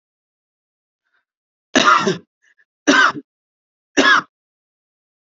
{"three_cough_length": "5.2 s", "three_cough_amplitude": 32227, "three_cough_signal_mean_std_ratio": 0.33, "survey_phase": "beta (2021-08-13 to 2022-03-07)", "age": "18-44", "gender": "Male", "wearing_mask": "No", "symptom_sore_throat": true, "symptom_diarrhoea": true, "smoker_status": "Never smoked", "respiratory_condition_asthma": false, "respiratory_condition_other": false, "recruitment_source": "REACT", "submission_delay": "0 days", "covid_test_result": "Negative", "covid_test_method": "RT-qPCR", "influenza_a_test_result": "Negative", "influenza_b_test_result": "Negative"}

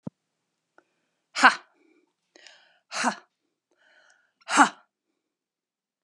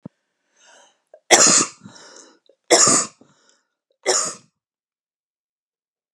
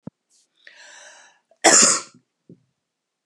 {"exhalation_length": "6.0 s", "exhalation_amplitude": 29321, "exhalation_signal_mean_std_ratio": 0.2, "three_cough_length": "6.1 s", "three_cough_amplitude": 32768, "three_cough_signal_mean_std_ratio": 0.31, "cough_length": "3.3 s", "cough_amplitude": 32471, "cough_signal_mean_std_ratio": 0.27, "survey_phase": "beta (2021-08-13 to 2022-03-07)", "age": "45-64", "gender": "Female", "wearing_mask": "No", "symptom_runny_or_blocked_nose": true, "symptom_headache": true, "smoker_status": "Never smoked", "respiratory_condition_asthma": false, "respiratory_condition_other": false, "recruitment_source": "Test and Trace", "submission_delay": "3 days", "covid_test_result": "Positive", "covid_test_method": "RT-qPCR", "covid_ct_value": 34.9, "covid_ct_gene": "ORF1ab gene", "covid_ct_mean": 35.7, "covid_viral_load": "2 copies/ml", "covid_viral_load_category": "Minimal viral load (< 10K copies/ml)"}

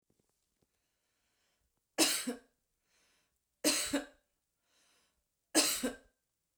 {"three_cough_length": "6.6 s", "three_cough_amplitude": 8393, "three_cough_signal_mean_std_ratio": 0.3, "survey_phase": "beta (2021-08-13 to 2022-03-07)", "age": "45-64", "gender": "Female", "wearing_mask": "No", "symptom_runny_or_blocked_nose": true, "symptom_sore_throat": true, "symptom_onset": "13 days", "smoker_status": "Ex-smoker", "respiratory_condition_asthma": false, "respiratory_condition_other": false, "recruitment_source": "REACT", "submission_delay": "1 day", "covid_test_result": "Negative", "covid_test_method": "RT-qPCR"}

